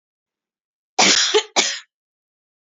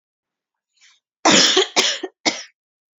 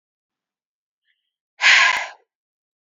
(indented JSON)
{
  "cough_length": "2.6 s",
  "cough_amplitude": 31073,
  "cough_signal_mean_std_ratio": 0.38,
  "three_cough_length": "3.0 s",
  "three_cough_amplitude": 32765,
  "three_cough_signal_mean_std_ratio": 0.39,
  "exhalation_length": "2.8 s",
  "exhalation_amplitude": 29025,
  "exhalation_signal_mean_std_ratio": 0.3,
  "survey_phase": "beta (2021-08-13 to 2022-03-07)",
  "age": "18-44",
  "gender": "Female",
  "wearing_mask": "No",
  "symptom_none": true,
  "smoker_status": "Never smoked",
  "respiratory_condition_asthma": false,
  "respiratory_condition_other": false,
  "recruitment_source": "REACT",
  "submission_delay": "2 days",
  "covid_test_result": "Negative",
  "covid_test_method": "RT-qPCR",
  "influenza_a_test_result": "Negative",
  "influenza_b_test_result": "Negative"
}